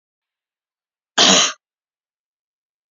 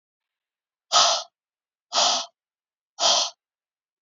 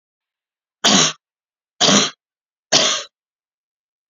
cough_length: 2.9 s
cough_amplitude: 32768
cough_signal_mean_std_ratio: 0.27
exhalation_length: 4.0 s
exhalation_amplitude: 20579
exhalation_signal_mean_std_ratio: 0.37
three_cough_length: 4.1 s
three_cough_amplitude: 32768
three_cough_signal_mean_std_ratio: 0.36
survey_phase: beta (2021-08-13 to 2022-03-07)
age: 65+
gender: Female
wearing_mask: 'No'
symptom_none: true
smoker_status: Never smoked
respiratory_condition_asthma: false
respiratory_condition_other: false
recruitment_source: REACT
submission_delay: 2 days
covid_test_result: Negative
covid_test_method: RT-qPCR
influenza_a_test_result: Unknown/Void
influenza_b_test_result: Unknown/Void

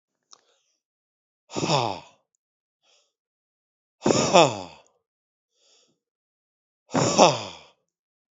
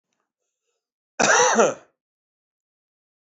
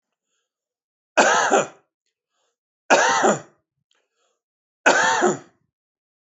exhalation_length: 8.4 s
exhalation_amplitude: 30866
exhalation_signal_mean_std_ratio: 0.27
cough_length: 3.2 s
cough_amplitude: 22241
cough_signal_mean_std_ratio: 0.33
three_cough_length: 6.2 s
three_cough_amplitude: 27679
three_cough_signal_mean_std_ratio: 0.39
survey_phase: beta (2021-08-13 to 2022-03-07)
age: 65+
gender: Male
wearing_mask: 'No'
symptom_runny_or_blocked_nose: true
symptom_fatigue: true
symptom_loss_of_taste: true
symptom_onset: 5 days
smoker_status: Never smoked
respiratory_condition_asthma: false
respiratory_condition_other: false
recruitment_source: Test and Trace
submission_delay: 1 day
covid_test_result: Positive
covid_test_method: RT-qPCR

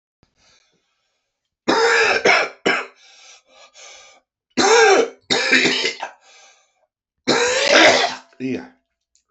three_cough_length: 9.3 s
three_cough_amplitude: 29203
three_cough_signal_mean_std_ratio: 0.48
survey_phase: beta (2021-08-13 to 2022-03-07)
age: 45-64
gender: Male
wearing_mask: 'No'
symptom_cough_any: true
symptom_runny_or_blocked_nose: true
symptom_shortness_of_breath: true
symptom_abdominal_pain: true
symptom_diarrhoea: true
symptom_fatigue: true
symptom_headache: true
symptom_other: true
smoker_status: Ex-smoker
respiratory_condition_asthma: false
respiratory_condition_other: true
recruitment_source: Test and Trace
submission_delay: 1 day
covid_test_result: Positive
covid_test_method: LFT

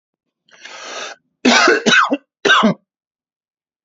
cough_length: 3.8 s
cough_amplitude: 32768
cough_signal_mean_std_ratio: 0.44
survey_phase: alpha (2021-03-01 to 2021-08-12)
age: 45-64
gender: Male
wearing_mask: 'No'
symptom_none: true
smoker_status: Ex-smoker
respiratory_condition_asthma: false
respiratory_condition_other: false
recruitment_source: REACT
submission_delay: 1 day
covid_test_result: Negative
covid_test_method: RT-qPCR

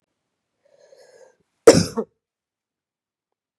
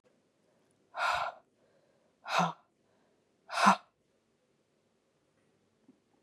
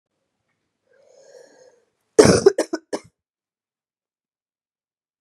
cough_length: 3.6 s
cough_amplitude: 32768
cough_signal_mean_std_ratio: 0.17
exhalation_length: 6.2 s
exhalation_amplitude: 9839
exhalation_signal_mean_std_ratio: 0.26
three_cough_length: 5.2 s
three_cough_amplitude: 32768
three_cough_signal_mean_std_ratio: 0.2
survey_phase: beta (2021-08-13 to 2022-03-07)
age: 18-44
gender: Male
wearing_mask: 'No'
symptom_cough_any: true
symptom_new_continuous_cough: true
symptom_runny_or_blocked_nose: true
symptom_sore_throat: true
symptom_fatigue: true
symptom_other: true
smoker_status: Ex-smoker
respiratory_condition_asthma: false
respiratory_condition_other: false
recruitment_source: Test and Trace
submission_delay: 1 day
covid_test_result: Negative
covid_test_method: RT-qPCR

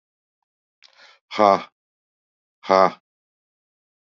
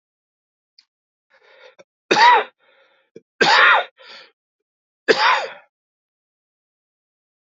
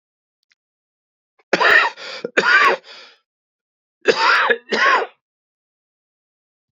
exhalation_length: 4.2 s
exhalation_amplitude: 27833
exhalation_signal_mean_std_ratio: 0.22
three_cough_length: 7.5 s
three_cough_amplitude: 31230
three_cough_signal_mean_std_ratio: 0.31
cough_length: 6.7 s
cough_amplitude: 31666
cough_signal_mean_std_ratio: 0.41
survey_phase: beta (2021-08-13 to 2022-03-07)
age: 45-64
gender: Male
wearing_mask: 'Yes'
symptom_cough_any: true
symptom_new_continuous_cough: true
symptom_runny_or_blocked_nose: true
symptom_sore_throat: true
symptom_fatigue: true
symptom_fever_high_temperature: true
symptom_headache: true
symptom_onset: 4 days
smoker_status: Never smoked
respiratory_condition_asthma: false
respiratory_condition_other: false
recruitment_source: Test and Trace
submission_delay: 2 days
covid_test_result: Positive
covid_test_method: RT-qPCR
covid_ct_value: 17.8
covid_ct_gene: ORF1ab gene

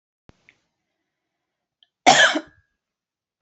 cough_length: 3.4 s
cough_amplitude: 29928
cough_signal_mean_std_ratio: 0.23
survey_phase: beta (2021-08-13 to 2022-03-07)
age: 45-64
gender: Female
wearing_mask: 'No'
symptom_none: true
smoker_status: Never smoked
respiratory_condition_asthma: false
respiratory_condition_other: false
recruitment_source: REACT
submission_delay: 9 days
covid_test_result: Negative
covid_test_method: RT-qPCR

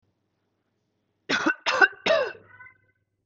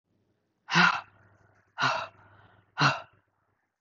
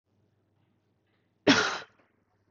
three_cough_length: 3.3 s
three_cough_amplitude: 21247
three_cough_signal_mean_std_ratio: 0.36
exhalation_length: 3.8 s
exhalation_amplitude: 13126
exhalation_signal_mean_std_ratio: 0.34
cough_length: 2.5 s
cough_amplitude: 13810
cough_signal_mean_std_ratio: 0.25
survey_phase: beta (2021-08-13 to 2022-03-07)
age: 18-44
gender: Female
wearing_mask: 'No'
symptom_cough_any: true
symptom_sore_throat: true
smoker_status: Never smoked
respiratory_condition_asthma: false
respiratory_condition_other: false
recruitment_source: Test and Trace
submission_delay: 2 days
covid_test_result: Positive
covid_test_method: RT-qPCR
covid_ct_value: 20.0
covid_ct_gene: ORF1ab gene
covid_ct_mean: 20.2
covid_viral_load: 230000 copies/ml
covid_viral_load_category: Low viral load (10K-1M copies/ml)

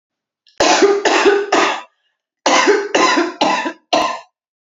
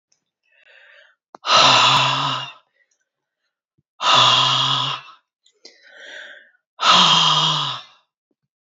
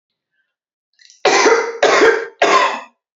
cough_length: 4.6 s
cough_amplitude: 32768
cough_signal_mean_std_ratio: 0.66
exhalation_length: 8.6 s
exhalation_amplitude: 28673
exhalation_signal_mean_std_ratio: 0.49
three_cough_length: 3.2 s
three_cough_amplitude: 29947
three_cough_signal_mean_std_ratio: 0.55
survey_phase: alpha (2021-03-01 to 2021-08-12)
age: 45-64
gender: Female
wearing_mask: 'No'
symptom_cough_any: true
symptom_fatigue: true
symptom_loss_of_taste: true
smoker_status: Never smoked
respiratory_condition_asthma: false
respiratory_condition_other: false
recruitment_source: Test and Trace
submission_delay: 2 days
covid_test_result: Positive
covid_test_method: RT-qPCR
covid_ct_value: 12.2
covid_ct_gene: ORF1ab gene
covid_ct_mean: 12.9
covid_viral_load: 58000000 copies/ml
covid_viral_load_category: High viral load (>1M copies/ml)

